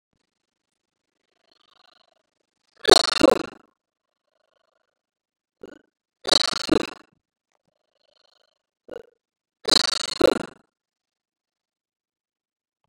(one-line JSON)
{"three_cough_length": "12.9 s", "three_cough_amplitude": 32746, "three_cough_signal_mean_std_ratio": 0.2, "survey_phase": "beta (2021-08-13 to 2022-03-07)", "age": "65+", "gender": "Female", "wearing_mask": "No", "symptom_runny_or_blocked_nose": true, "smoker_status": "Ex-smoker", "respiratory_condition_asthma": false, "respiratory_condition_other": false, "recruitment_source": "REACT", "submission_delay": "1 day", "covid_test_result": "Negative", "covid_test_method": "RT-qPCR", "influenza_a_test_result": "Negative", "influenza_b_test_result": "Negative"}